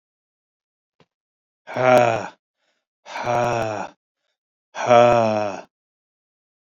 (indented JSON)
{
  "exhalation_length": "6.7 s",
  "exhalation_amplitude": 27821,
  "exhalation_signal_mean_std_ratio": 0.39,
  "survey_phase": "beta (2021-08-13 to 2022-03-07)",
  "age": "45-64",
  "gender": "Male",
  "wearing_mask": "No",
  "symptom_fatigue": true,
  "symptom_headache": true,
  "symptom_loss_of_taste": true,
  "symptom_onset": "3 days",
  "smoker_status": "Ex-smoker",
  "respiratory_condition_asthma": false,
  "respiratory_condition_other": false,
  "recruitment_source": "Test and Trace",
  "submission_delay": "2 days",
  "covid_test_result": "Positive",
  "covid_test_method": "RT-qPCR",
  "covid_ct_value": 26.2,
  "covid_ct_gene": "ORF1ab gene",
  "covid_ct_mean": 27.1,
  "covid_viral_load": "1300 copies/ml",
  "covid_viral_load_category": "Minimal viral load (< 10K copies/ml)"
}